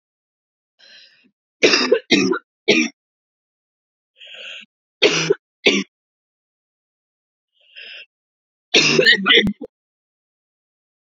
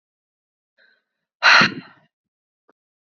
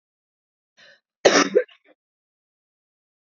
{
  "three_cough_length": "11.2 s",
  "three_cough_amplitude": 31623,
  "three_cough_signal_mean_std_ratio": 0.34,
  "exhalation_length": "3.1 s",
  "exhalation_amplitude": 28052,
  "exhalation_signal_mean_std_ratio": 0.24,
  "cough_length": "3.2 s",
  "cough_amplitude": 32767,
  "cough_signal_mean_std_ratio": 0.23,
  "survey_phase": "beta (2021-08-13 to 2022-03-07)",
  "age": "18-44",
  "gender": "Female",
  "wearing_mask": "No",
  "symptom_shortness_of_breath": true,
  "symptom_sore_throat": true,
  "symptom_fatigue": true,
  "symptom_fever_high_temperature": true,
  "symptom_headache": true,
  "symptom_onset": "3 days",
  "smoker_status": "Current smoker (1 to 10 cigarettes per day)",
  "respiratory_condition_asthma": false,
  "respiratory_condition_other": false,
  "recruitment_source": "Test and Trace",
  "submission_delay": "2 days",
  "covid_test_result": "Positive",
  "covid_test_method": "ePCR"
}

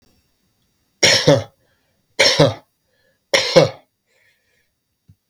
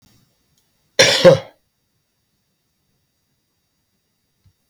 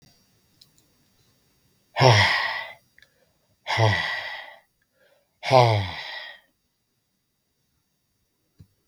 {
  "three_cough_length": "5.3 s",
  "three_cough_amplitude": 32768,
  "three_cough_signal_mean_std_ratio": 0.34,
  "cough_length": "4.7 s",
  "cough_amplitude": 32768,
  "cough_signal_mean_std_ratio": 0.21,
  "exhalation_length": "8.9 s",
  "exhalation_amplitude": 27717,
  "exhalation_signal_mean_std_ratio": 0.33,
  "survey_phase": "beta (2021-08-13 to 2022-03-07)",
  "age": "65+",
  "gender": "Male",
  "wearing_mask": "No",
  "symptom_none": true,
  "smoker_status": "Ex-smoker",
  "respiratory_condition_asthma": false,
  "respiratory_condition_other": false,
  "recruitment_source": "REACT",
  "submission_delay": "7 days",
  "covid_test_result": "Negative",
  "covid_test_method": "RT-qPCR",
  "influenza_a_test_result": "Negative",
  "influenza_b_test_result": "Negative"
}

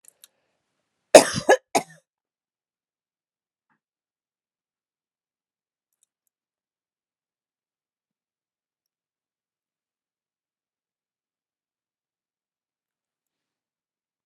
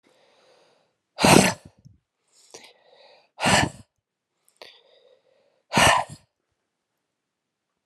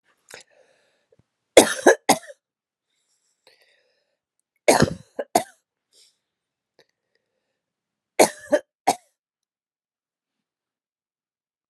{
  "cough_length": "14.3 s",
  "cough_amplitude": 32768,
  "cough_signal_mean_std_ratio": 0.09,
  "exhalation_length": "7.9 s",
  "exhalation_amplitude": 32751,
  "exhalation_signal_mean_std_ratio": 0.26,
  "three_cough_length": "11.7 s",
  "three_cough_amplitude": 32768,
  "three_cough_signal_mean_std_ratio": 0.19,
  "survey_phase": "alpha (2021-03-01 to 2021-08-12)",
  "age": "45-64",
  "gender": "Female",
  "wearing_mask": "No",
  "symptom_cough_any": true,
  "symptom_abdominal_pain": true,
  "symptom_diarrhoea": true,
  "symptom_fatigue": true,
  "symptom_fever_high_temperature": true,
  "symptom_headache": true,
  "symptom_change_to_sense_of_smell_or_taste": true,
  "symptom_onset": "5 days",
  "smoker_status": "Ex-smoker",
  "respiratory_condition_asthma": false,
  "respiratory_condition_other": false,
  "recruitment_source": "Test and Trace",
  "submission_delay": "1 day",
  "covid_test_result": "Positive",
  "covid_test_method": "RT-qPCR",
  "covid_ct_value": 14.8,
  "covid_ct_gene": "N gene",
  "covid_ct_mean": 15.8,
  "covid_viral_load": "6600000 copies/ml",
  "covid_viral_load_category": "High viral load (>1M copies/ml)"
}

